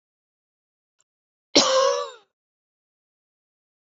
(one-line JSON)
{"cough_length": "3.9 s", "cough_amplitude": 27655, "cough_signal_mean_std_ratio": 0.28, "survey_phase": "beta (2021-08-13 to 2022-03-07)", "age": "45-64", "gender": "Female", "wearing_mask": "No", "symptom_runny_or_blocked_nose": true, "smoker_status": "Never smoked", "respiratory_condition_asthma": false, "respiratory_condition_other": false, "recruitment_source": "Test and Trace", "submission_delay": "-1 day", "covid_test_result": "Negative", "covid_test_method": "LFT"}